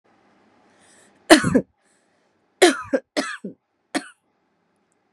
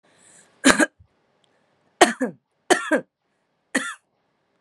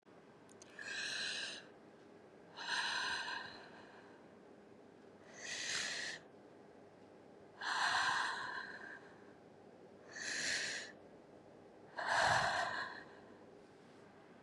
{"three_cough_length": "5.1 s", "three_cough_amplitude": 32768, "three_cough_signal_mean_std_ratio": 0.26, "cough_length": "4.6 s", "cough_amplitude": 32767, "cough_signal_mean_std_ratio": 0.28, "exhalation_length": "14.4 s", "exhalation_amplitude": 3031, "exhalation_signal_mean_std_ratio": 0.59, "survey_phase": "beta (2021-08-13 to 2022-03-07)", "age": "18-44", "gender": "Female", "wearing_mask": "No", "symptom_cough_any": true, "symptom_sore_throat": true, "symptom_fatigue": true, "symptom_headache": true, "symptom_onset": "3 days", "smoker_status": "Never smoked", "respiratory_condition_asthma": true, "respiratory_condition_other": false, "recruitment_source": "Test and Trace", "submission_delay": "1 day", "covid_test_result": "Positive", "covid_test_method": "RT-qPCR", "covid_ct_value": 19.4, "covid_ct_gene": "ORF1ab gene", "covid_ct_mean": 19.8, "covid_viral_load": "310000 copies/ml", "covid_viral_load_category": "Low viral load (10K-1M copies/ml)"}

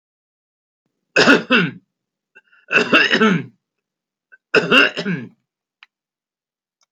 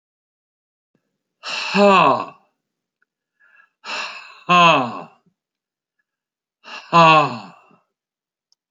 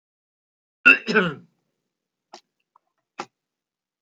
{"three_cough_length": "6.9 s", "three_cough_amplitude": 32768, "three_cough_signal_mean_std_ratio": 0.38, "exhalation_length": "8.7 s", "exhalation_amplitude": 29522, "exhalation_signal_mean_std_ratio": 0.34, "cough_length": "4.0 s", "cough_amplitude": 27981, "cough_signal_mean_std_ratio": 0.21, "survey_phase": "beta (2021-08-13 to 2022-03-07)", "age": "65+", "gender": "Male", "wearing_mask": "No", "symptom_none": true, "smoker_status": "Never smoked", "respiratory_condition_asthma": false, "respiratory_condition_other": false, "recruitment_source": "REACT", "submission_delay": "4 days", "covid_test_result": "Negative", "covid_test_method": "RT-qPCR"}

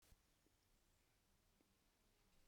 {"cough_length": "2.5 s", "cough_amplitude": 44, "cough_signal_mean_std_ratio": 0.93, "survey_phase": "beta (2021-08-13 to 2022-03-07)", "age": "65+", "gender": "Female", "wearing_mask": "No", "symptom_new_continuous_cough": true, "symptom_runny_or_blocked_nose": true, "symptom_fatigue": true, "symptom_change_to_sense_of_smell_or_taste": true, "symptom_loss_of_taste": true, "symptom_onset": "3 days", "smoker_status": "Ex-smoker", "respiratory_condition_asthma": false, "respiratory_condition_other": false, "recruitment_source": "Test and Trace", "submission_delay": "2 days", "covid_test_result": "Positive", "covid_test_method": "RT-qPCR", "covid_ct_value": 16.4, "covid_ct_gene": "ORF1ab gene", "covid_ct_mean": 16.9, "covid_viral_load": "2900000 copies/ml", "covid_viral_load_category": "High viral load (>1M copies/ml)"}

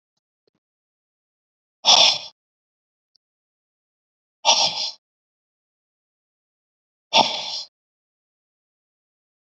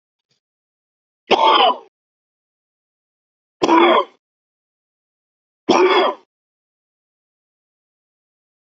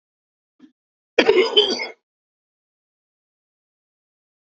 {"exhalation_length": "9.6 s", "exhalation_amplitude": 29202, "exhalation_signal_mean_std_ratio": 0.24, "three_cough_length": "8.8 s", "three_cough_amplitude": 28788, "three_cough_signal_mean_std_ratio": 0.31, "cough_length": "4.4 s", "cough_amplitude": 28045, "cough_signal_mean_std_ratio": 0.27, "survey_phase": "beta (2021-08-13 to 2022-03-07)", "age": "45-64", "gender": "Male", "wearing_mask": "No", "symptom_cough_any": true, "symptom_runny_or_blocked_nose": true, "symptom_fatigue": true, "symptom_headache": true, "symptom_change_to_sense_of_smell_or_taste": true, "symptom_loss_of_taste": true, "symptom_onset": "9 days", "smoker_status": "Never smoked", "respiratory_condition_asthma": true, "respiratory_condition_other": false, "recruitment_source": "Test and Trace", "submission_delay": "1 day", "covid_test_result": "Positive", "covid_test_method": "RT-qPCR", "covid_ct_value": 32.7, "covid_ct_gene": "N gene"}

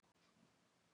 {"cough_length": "0.9 s", "cough_amplitude": 32, "cough_signal_mean_std_ratio": 1.02, "survey_phase": "beta (2021-08-13 to 2022-03-07)", "age": "65+", "gender": "Female", "wearing_mask": "No", "symptom_none": true, "smoker_status": "Never smoked", "respiratory_condition_asthma": true, "respiratory_condition_other": false, "recruitment_source": "REACT", "submission_delay": "3 days", "covid_test_result": "Negative", "covid_test_method": "RT-qPCR", "influenza_a_test_result": "Unknown/Void", "influenza_b_test_result": "Unknown/Void"}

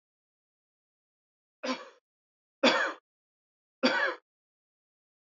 {"three_cough_length": "5.3 s", "three_cough_amplitude": 10692, "three_cough_signal_mean_std_ratio": 0.28, "survey_phase": "beta (2021-08-13 to 2022-03-07)", "age": "18-44", "gender": "Male", "wearing_mask": "No", "symptom_cough_any": true, "symptom_runny_or_blocked_nose": true, "symptom_shortness_of_breath": true, "symptom_fatigue": true, "symptom_headache": true, "symptom_change_to_sense_of_smell_or_taste": true, "symptom_loss_of_taste": true, "symptom_other": true, "symptom_onset": "6 days", "smoker_status": "Ex-smoker", "respiratory_condition_asthma": false, "respiratory_condition_other": false, "recruitment_source": "Test and Trace", "submission_delay": "2 days", "covid_test_result": "Positive", "covid_test_method": "RT-qPCR"}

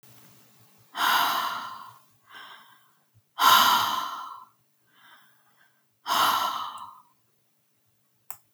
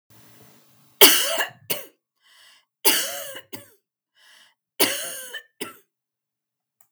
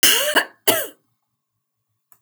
{"exhalation_length": "8.5 s", "exhalation_amplitude": 17845, "exhalation_signal_mean_std_ratio": 0.4, "three_cough_length": "6.9 s", "three_cough_amplitude": 32768, "three_cough_signal_mean_std_ratio": 0.29, "cough_length": "2.2 s", "cough_amplitude": 27763, "cough_signal_mean_std_ratio": 0.39, "survey_phase": "beta (2021-08-13 to 2022-03-07)", "age": "45-64", "gender": "Female", "wearing_mask": "No", "symptom_none": true, "smoker_status": "Never smoked", "respiratory_condition_asthma": false, "respiratory_condition_other": false, "recruitment_source": "REACT", "submission_delay": "3 days", "covid_test_result": "Negative", "covid_test_method": "RT-qPCR", "influenza_a_test_result": "Unknown/Void", "influenza_b_test_result": "Unknown/Void"}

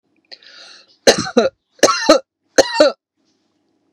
{"three_cough_length": "3.9 s", "three_cough_amplitude": 32768, "three_cough_signal_mean_std_ratio": 0.35, "survey_phase": "beta (2021-08-13 to 2022-03-07)", "age": "45-64", "gender": "Female", "wearing_mask": "No", "symptom_none": true, "smoker_status": "Ex-smoker", "respiratory_condition_asthma": false, "respiratory_condition_other": false, "recruitment_source": "REACT", "submission_delay": "2 days", "covid_test_result": "Negative", "covid_test_method": "RT-qPCR", "influenza_a_test_result": "Negative", "influenza_b_test_result": "Negative"}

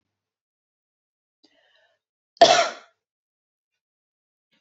{"cough_length": "4.6 s", "cough_amplitude": 28642, "cough_signal_mean_std_ratio": 0.18, "survey_phase": "beta (2021-08-13 to 2022-03-07)", "age": "18-44", "gender": "Female", "wearing_mask": "No", "symptom_none": true, "smoker_status": "Never smoked", "respiratory_condition_asthma": false, "respiratory_condition_other": false, "recruitment_source": "REACT", "submission_delay": "1 day", "covid_test_result": "Negative", "covid_test_method": "RT-qPCR", "influenza_a_test_result": "Unknown/Void", "influenza_b_test_result": "Unknown/Void"}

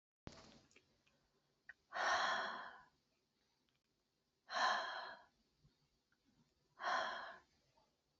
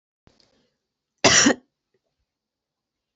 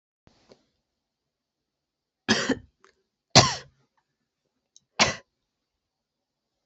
{"exhalation_length": "8.2 s", "exhalation_amplitude": 2150, "exhalation_signal_mean_std_ratio": 0.39, "cough_length": "3.2 s", "cough_amplitude": 28145, "cough_signal_mean_std_ratio": 0.24, "three_cough_length": "6.7 s", "three_cough_amplitude": 32414, "three_cough_signal_mean_std_ratio": 0.2, "survey_phase": "beta (2021-08-13 to 2022-03-07)", "age": "45-64", "gender": "Female", "wearing_mask": "No", "symptom_none": true, "smoker_status": "Never smoked", "respiratory_condition_asthma": false, "respiratory_condition_other": false, "recruitment_source": "REACT", "submission_delay": "3 days", "covid_test_result": "Negative", "covid_test_method": "RT-qPCR", "influenza_a_test_result": "Negative", "influenza_b_test_result": "Negative"}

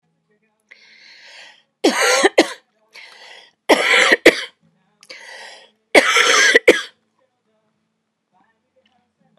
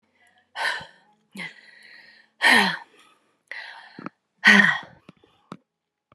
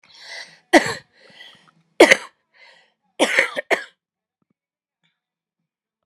{"three_cough_length": "9.4 s", "three_cough_amplitude": 32768, "three_cough_signal_mean_std_ratio": 0.35, "exhalation_length": "6.1 s", "exhalation_amplitude": 31068, "exhalation_signal_mean_std_ratio": 0.31, "cough_length": "6.1 s", "cough_amplitude": 32768, "cough_signal_mean_std_ratio": 0.24, "survey_phase": "beta (2021-08-13 to 2022-03-07)", "age": "45-64", "gender": "Female", "wearing_mask": "No", "symptom_cough_any": true, "symptom_sore_throat": true, "symptom_change_to_sense_of_smell_or_taste": true, "smoker_status": "Never smoked", "respiratory_condition_asthma": false, "respiratory_condition_other": false, "recruitment_source": "Test and Trace", "submission_delay": "4 days", "covid_test_result": "Positive", "covid_test_method": "RT-qPCR", "covid_ct_value": 36.7, "covid_ct_gene": "ORF1ab gene"}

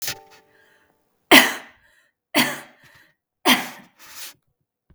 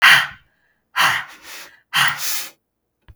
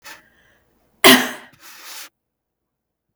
{"three_cough_length": "4.9 s", "three_cough_amplitude": 32768, "three_cough_signal_mean_std_ratio": 0.27, "exhalation_length": "3.2 s", "exhalation_amplitude": 32768, "exhalation_signal_mean_std_ratio": 0.43, "cough_length": "3.2 s", "cough_amplitude": 32768, "cough_signal_mean_std_ratio": 0.23, "survey_phase": "beta (2021-08-13 to 2022-03-07)", "age": "18-44", "gender": "Female", "wearing_mask": "No", "symptom_none": true, "smoker_status": "Never smoked", "respiratory_condition_asthma": false, "respiratory_condition_other": false, "recruitment_source": "REACT", "submission_delay": "8 days", "covid_test_result": "Negative", "covid_test_method": "RT-qPCR"}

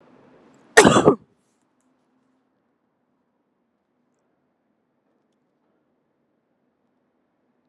{"cough_length": "7.7 s", "cough_amplitude": 32768, "cough_signal_mean_std_ratio": 0.16, "survey_phase": "beta (2021-08-13 to 2022-03-07)", "age": "18-44", "gender": "Female", "wearing_mask": "No", "symptom_cough_any": true, "symptom_new_continuous_cough": true, "smoker_status": "Never smoked", "respiratory_condition_asthma": false, "respiratory_condition_other": false, "recruitment_source": "REACT", "submission_delay": "0 days", "covid_test_result": "Negative", "covid_test_method": "RT-qPCR", "influenza_a_test_result": "Negative", "influenza_b_test_result": "Negative"}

